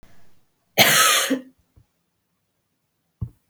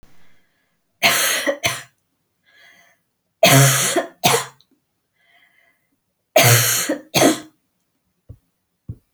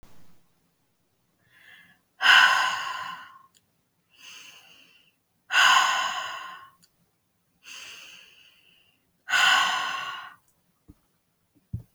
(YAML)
cough_length: 3.5 s
cough_amplitude: 31739
cough_signal_mean_std_ratio: 0.35
three_cough_length: 9.1 s
three_cough_amplitude: 32767
three_cough_signal_mean_std_ratio: 0.4
exhalation_length: 11.9 s
exhalation_amplitude: 20596
exhalation_signal_mean_std_ratio: 0.36
survey_phase: beta (2021-08-13 to 2022-03-07)
age: 45-64
gender: Female
wearing_mask: 'No'
symptom_none: true
smoker_status: Never smoked
respiratory_condition_asthma: false
respiratory_condition_other: false
recruitment_source: REACT
submission_delay: 1 day
covid_test_result: Negative
covid_test_method: RT-qPCR